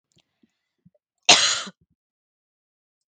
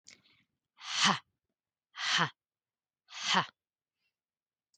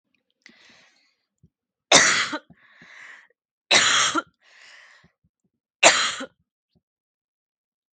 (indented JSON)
{
  "cough_length": "3.1 s",
  "cough_amplitude": 32768,
  "cough_signal_mean_std_ratio": 0.22,
  "exhalation_length": "4.8 s",
  "exhalation_amplitude": 8474,
  "exhalation_signal_mean_std_ratio": 0.32,
  "three_cough_length": "7.9 s",
  "three_cough_amplitude": 32768,
  "three_cough_signal_mean_std_ratio": 0.3,
  "survey_phase": "beta (2021-08-13 to 2022-03-07)",
  "age": "18-44",
  "gender": "Female",
  "wearing_mask": "No",
  "symptom_cough_any": true,
  "symptom_runny_or_blocked_nose": true,
  "symptom_onset": "12 days",
  "smoker_status": "Never smoked",
  "respiratory_condition_asthma": false,
  "respiratory_condition_other": false,
  "recruitment_source": "REACT",
  "submission_delay": "3 days",
  "covid_test_result": "Negative",
  "covid_test_method": "RT-qPCR",
  "influenza_a_test_result": "Negative",
  "influenza_b_test_result": "Negative"
}